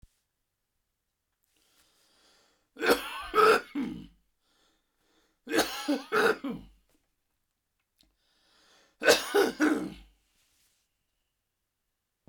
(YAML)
three_cough_length: 12.3 s
three_cough_amplitude: 15765
three_cough_signal_mean_std_ratio: 0.32
survey_phase: beta (2021-08-13 to 2022-03-07)
age: 65+
gender: Male
wearing_mask: 'No'
symptom_none: true
smoker_status: Ex-smoker
respiratory_condition_asthma: false
respiratory_condition_other: false
recruitment_source: REACT
submission_delay: 2 days
covid_test_result: Negative
covid_test_method: RT-qPCR